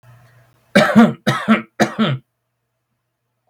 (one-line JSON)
{"three_cough_length": "3.5 s", "three_cough_amplitude": 32768, "three_cough_signal_mean_std_ratio": 0.4, "survey_phase": "beta (2021-08-13 to 2022-03-07)", "age": "18-44", "gender": "Male", "wearing_mask": "No", "symptom_runny_or_blocked_nose": true, "symptom_sore_throat": true, "smoker_status": "Ex-smoker", "respiratory_condition_asthma": false, "respiratory_condition_other": false, "recruitment_source": "Test and Trace", "submission_delay": "2 days", "covid_test_result": "Positive", "covid_test_method": "ePCR"}